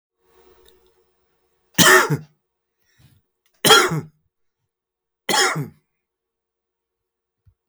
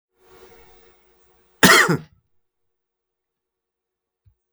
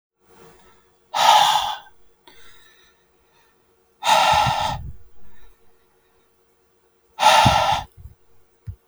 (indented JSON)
{
  "three_cough_length": "7.7 s",
  "three_cough_amplitude": 32768,
  "three_cough_signal_mean_std_ratio": 0.28,
  "cough_length": "4.5 s",
  "cough_amplitude": 32768,
  "cough_signal_mean_std_ratio": 0.23,
  "exhalation_length": "8.9 s",
  "exhalation_amplitude": 30152,
  "exhalation_signal_mean_std_ratio": 0.42,
  "survey_phase": "beta (2021-08-13 to 2022-03-07)",
  "age": "45-64",
  "gender": "Male",
  "wearing_mask": "No",
  "symptom_abdominal_pain": true,
  "symptom_headache": true,
  "symptom_onset": "12 days",
  "smoker_status": "Never smoked",
  "respiratory_condition_asthma": false,
  "respiratory_condition_other": false,
  "recruitment_source": "REACT",
  "submission_delay": "1 day",
  "covid_test_result": "Negative",
  "covid_test_method": "RT-qPCR",
  "influenza_a_test_result": "Negative",
  "influenza_b_test_result": "Negative"
}